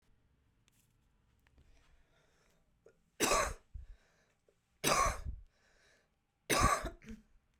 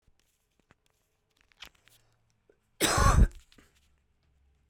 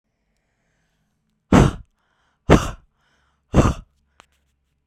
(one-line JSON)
{"three_cough_length": "7.6 s", "three_cough_amplitude": 5478, "three_cough_signal_mean_std_ratio": 0.33, "cough_length": "4.7 s", "cough_amplitude": 9727, "cough_signal_mean_std_ratio": 0.25, "exhalation_length": "4.9 s", "exhalation_amplitude": 32768, "exhalation_signal_mean_std_ratio": 0.26, "survey_phase": "beta (2021-08-13 to 2022-03-07)", "age": "18-44", "gender": "Female", "wearing_mask": "No", "symptom_shortness_of_breath": true, "symptom_sore_throat": true, "symptom_fatigue": true, "symptom_headache": true, "symptom_other": true, "symptom_onset": "7 days", "smoker_status": "Current smoker (11 or more cigarettes per day)", "respiratory_condition_asthma": true, "respiratory_condition_other": false, "recruitment_source": "REACT", "submission_delay": "1 day", "covid_test_result": "Negative", "covid_test_method": "RT-qPCR"}